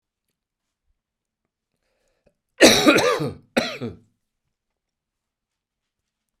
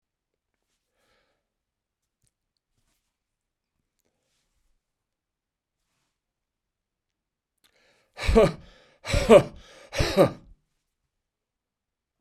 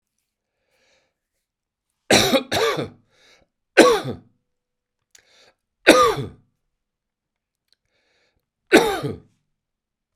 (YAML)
cough_length: 6.4 s
cough_amplitude: 32768
cough_signal_mean_std_ratio: 0.26
exhalation_length: 12.2 s
exhalation_amplitude: 25828
exhalation_signal_mean_std_ratio: 0.2
three_cough_length: 10.2 s
three_cough_amplitude: 32768
three_cough_signal_mean_std_ratio: 0.29
survey_phase: beta (2021-08-13 to 2022-03-07)
age: 65+
gender: Male
wearing_mask: 'No'
symptom_cough_any: true
symptom_runny_or_blocked_nose: true
symptom_sore_throat: true
symptom_fatigue: true
symptom_change_to_sense_of_smell_or_taste: true
symptom_loss_of_taste: true
symptom_onset: 2 days
smoker_status: Ex-smoker
respiratory_condition_asthma: false
respiratory_condition_other: false
recruitment_source: Test and Trace
submission_delay: 1 day
covid_test_result: Positive
covid_test_method: RT-qPCR
covid_ct_value: 25.6
covid_ct_gene: ORF1ab gene
covid_ct_mean: 26.2
covid_viral_load: 2500 copies/ml
covid_viral_load_category: Minimal viral load (< 10K copies/ml)